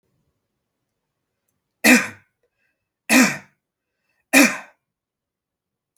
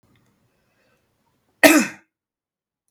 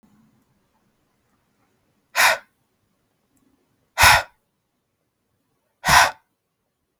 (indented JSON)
{
  "three_cough_length": "6.0 s",
  "three_cough_amplitude": 32768,
  "three_cough_signal_mean_std_ratio": 0.26,
  "cough_length": "2.9 s",
  "cough_amplitude": 32768,
  "cough_signal_mean_std_ratio": 0.21,
  "exhalation_length": "7.0 s",
  "exhalation_amplitude": 32768,
  "exhalation_signal_mean_std_ratio": 0.24,
  "survey_phase": "beta (2021-08-13 to 2022-03-07)",
  "age": "18-44",
  "gender": "Male",
  "wearing_mask": "No",
  "symptom_cough_any": true,
  "symptom_runny_or_blocked_nose": true,
  "symptom_sore_throat": true,
  "symptom_fatigue": true,
  "symptom_onset": "4 days",
  "smoker_status": "Never smoked",
  "respiratory_condition_asthma": false,
  "respiratory_condition_other": false,
  "recruitment_source": "Test and Trace",
  "submission_delay": "2 days",
  "covid_test_result": "Positive",
  "covid_test_method": "RT-qPCR",
  "covid_ct_value": 28.8,
  "covid_ct_gene": "N gene"
}